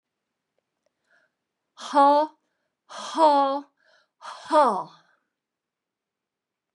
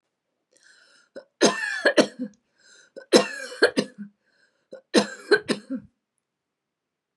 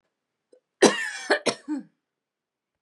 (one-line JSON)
{"exhalation_length": "6.7 s", "exhalation_amplitude": 16450, "exhalation_signal_mean_std_ratio": 0.34, "three_cough_length": "7.2 s", "three_cough_amplitude": 29731, "three_cough_signal_mean_std_ratio": 0.31, "cough_length": "2.8 s", "cough_amplitude": 29314, "cough_signal_mean_std_ratio": 0.3, "survey_phase": "beta (2021-08-13 to 2022-03-07)", "age": "65+", "gender": "Female", "wearing_mask": "No", "symptom_none": true, "smoker_status": "Never smoked", "respiratory_condition_asthma": true, "respiratory_condition_other": false, "recruitment_source": "REACT", "submission_delay": "5 days", "covid_test_result": "Negative", "covid_test_method": "RT-qPCR", "influenza_a_test_result": "Negative", "influenza_b_test_result": "Negative"}